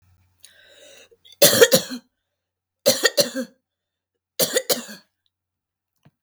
{"three_cough_length": "6.2 s", "three_cough_amplitude": 32768, "three_cough_signal_mean_std_ratio": 0.3, "survey_phase": "beta (2021-08-13 to 2022-03-07)", "age": "45-64", "gender": "Female", "wearing_mask": "No", "symptom_none": true, "smoker_status": "Never smoked", "respiratory_condition_asthma": true, "respiratory_condition_other": false, "recruitment_source": "REACT", "submission_delay": "1 day", "covid_test_result": "Negative", "covid_test_method": "RT-qPCR"}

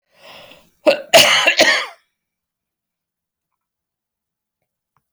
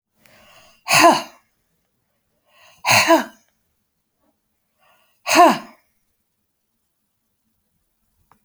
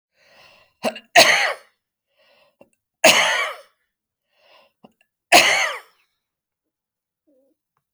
{"cough_length": "5.1 s", "cough_amplitude": 32768, "cough_signal_mean_std_ratio": 0.31, "exhalation_length": "8.4 s", "exhalation_amplitude": 31909, "exhalation_signal_mean_std_ratio": 0.27, "three_cough_length": "7.9 s", "three_cough_amplitude": 32767, "three_cough_signal_mean_std_ratio": 0.3, "survey_phase": "beta (2021-08-13 to 2022-03-07)", "age": "65+", "gender": "Female", "wearing_mask": "No", "symptom_fatigue": true, "symptom_onset": "12 days", "smoker_status": "Never smoked", "respiratory_condition_asthma": false, "respiratory_condition_other": false, "recruitment_source": "REACT", "submission_delay": "3 days", "covid_test_result": "Negative", "covid_test_method": "RT-qPCR"}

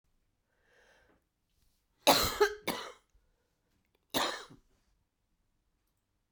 {"cough_length": "6.3 s", "cough_amplitude": 12886, "cough_signal_mean_std_ratio": 0.25, "survey_phase": "beta (2021-08-13 to 2022-03-07)", "age": "65+", "gender": "Female", "wearing_mask": "No", "symptom_cough_any": true, "symptom_sore_throat": true, "symptom_fatigue": true, "symptom_headache": true, "symptom_change_to_sense_of_smell_or_taste": true, "symptom_loss_of_taste": true, "symptom_onset": "4 days", "smoker_status": "Ex-smoker", "respiratory_condition_asthma": false, "respiratory_condition_other": true, "recruitment_source": "Test and Trace", "submission_delay": "2 days", "covid_test_result": "Positive", "covid_test_method": "RT-qPCR", "covid_ct_value": 35.7, "covid_ct_gene": "ORF1ab gene"}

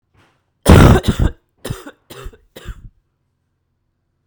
{"three_cough_length": "4.3 s", "three_cough_amplitude": 32768, "three_cough_signal_mean_std_ratio": 0.3, "survey_phase": "beta (2021-08-13 to 2022-03-07)", "age": "18-44", "gender": "Female", "wearing_mask": "No", "symptom_cough_any": true, "symptom_new_continuous_cough": true, "symptom_runny_or_blocked_nose": true, "symptom_fatigue": true, "symptom_fever_high_temperature": true, "symptom_headache": true, "symptom_change_to_sense_of_smell_or_taste": true, "symptom_loss_of_taste": true, "symptom_onset": "3 days", "smoker_status": "Never smoked", "respiratory_condition_asthma": false, "respiratory_condition_other": false, "recruitment_source": "Test and Trace", "submission_delay": "2 days", "covid_test_result": "Positive", "covid_test_method": "RT-qPCR", "covid_ct_value": 27.5, "covid_ct_gene": "N gene"}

